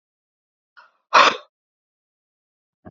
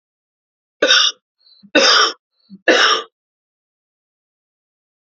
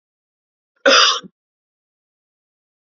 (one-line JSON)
{"exhalation_length": "2.9 s", "exhalation_amplitude": 29081, "exhalation_signal_mean_std_ratio": 0.2, "three_cough_length": "5.0 s", "three_cough_amplitude": 32768, "three_cough_signal_mean_std_ratio": 0.36, "cough_length": "2.8 s", "cough_amplitude": 31731, "cough_signal_mean_std_ratio": 0.27, "survey_phase": "alpha (2021-03-01 to 2021-08-12)", "age": "18-44", "gender": "Male", "wearing_mask": "No", "symptom_cough_any": true, "symptom_onset": "6 days", "smoker_status": "Never smoked", "respiratory_condition_asthma": false, "respiratory_condition_other": false, "recruitment_source": "Test and Trace", "submission_delay": "1 day", "covid_test_result": "Positive", "covid_test_method": "RT-qPCR", "covid_ct_value": 24.2, "covid_ct_gene": "N gene"}